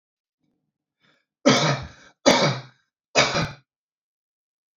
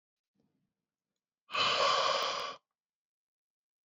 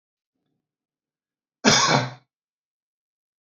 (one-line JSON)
{"three_cough_length": "4.8 s", "three_cough_amplitude": 30001, "three_cough_signal_mean_std_ratio": 0.35, "exhalation_length": "3.8 s", "exhalation_amplitude": 4578, "exhalation_signal_mean_std_ratio": 0.42, "cough_length": "3.4 s", "cough_amplitude": 24871, "cough_signal_mean_std_ratio": 0.27, "survey_phase": "beta (2021-08-13 to 2022-03-07)", "age": "45-64", "gender": "Male", "wearing_mask": "No", "symptom_none": true, "smoker_status": "Never smoked", "respiratory_condition_asthma": false, "respiratory_condition_other": false, "recruitment_source": "REACT", "submission_delay": "2 days", "covid_test_result": "Negative", "covid_test_method": "RT-qPCR", "influenza_a_test_result": "Negative", "influenza_b_test_result": "Negative"}